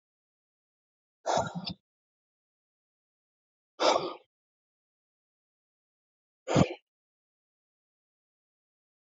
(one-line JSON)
{"exhalation_length": "9.0 s", "exhalation_amplitude": 12307, "exhalation_signal_mean_std_ratio": 0.22, "survey_phase": "alpha (2021-03-01 to 2021-08-12)", "age": "45-64", "gender": "Male", "wearing_mask": "No", "symptom_none": true, "smoker_status": "Ex-smoker", "respiratory_condition_asthma": false, "respiratory_condition_other": false, "recruitment_source": "REACT", "submission_delay": "2 days", "covid_test_result": "Negative", "covid_test_method": "RT-qPCR"}